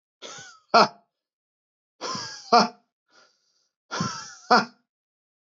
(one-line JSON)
{"exhalation_length": "5.5 s", "exhalation_amplitude": 19737, "exhalation_signal_mean_std_ratio": 0.28, "survey_phase": "beta (2021-08-13 to 2022-03-07)", "age": "18-44", "gender": "Male", "wearing_mask": "No", "symptom_cough_any": true, "symptom_runny_or_blocked_nose": true, "symptom_shortness_of_breath": true, "symptom_fatigue": true, "symptom_headache": true, "symptom_change_to_sense_of_smell_or_taste": true, "symptom_onset": "2 days", "smoker_status": "Never smoked", "respiratory_condition_asthma": false, "respiratory_condition_other": false, "recruitment_source": "Test and Trace", "submission_delay": "2 days", "covid_test_result": "Positive", "covid_test_method": "RT-qPCR", "covid_ct_value": 23.0, "covid_ct_gene": "ORF1ab gene", "covid_ct_mean": 23.4, "covid_viral_load": "22000 copies/ml", "covid_viral_load_category": "Low viral load (10K-1M copies/ml)"}